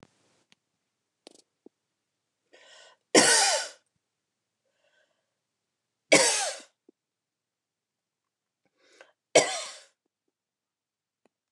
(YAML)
three_cough_length: 11.5 s
three_cough_amplitude: 22121
three_cough_signal_mean_std_ratio: 0.23
survey_phase: beta (2021-08-13 to 2022-03-07)
age: 65+
gender: Female
wearing_mask: 'No'
symptom_none: true
smoker_status: Ex-smoker
respiratory_condition_asthma: false
respiratory_condition_other: false
recruitment_source: REACT
submission_delay: 5 days
covid_test_result: Negative
covid_test_method: RT-qPCR
influenza_a_test_result: Negative
influenza_b_test_result: Negative